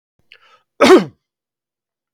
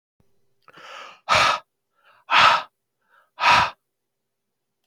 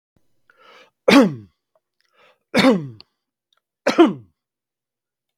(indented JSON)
{
  "cough_length": "2.1 s",
  "cough_amplitude": 32768,
  "cough_signal_mean_std_ratio": 0.27,
  "exhalation_length": "4.9 s",
  "exhalation_amplitude": 26243,
  "exhalation_signal_mean_std_ratio": 0.35,
  "three_cough_length": "5.4 s",
  "three_cough_amplitude": 32768,
  "three_cough_signal_mean_std_ratio": 0.29,
  "survey_phase": "beta (2021-08-13 to 2022-03-07)",
  "age": "45-64",
  "gender": "Male",
  "wearing_mask": "No",
  "symptom_none": true,
  "smoker_status": "Never smoked",
  "respiratory_condition_asthma": false,
  "respiratory_condition_other": false,
  "recruitment_source": "REACT",
  "submission_delay": "1 day",
  "covid_test_result": "Negative",
  "covid_test_method": "RT-qPCR",
  "influenza_a_test_result": "Negative",
  "influenza_b_test_result": "Negative"
}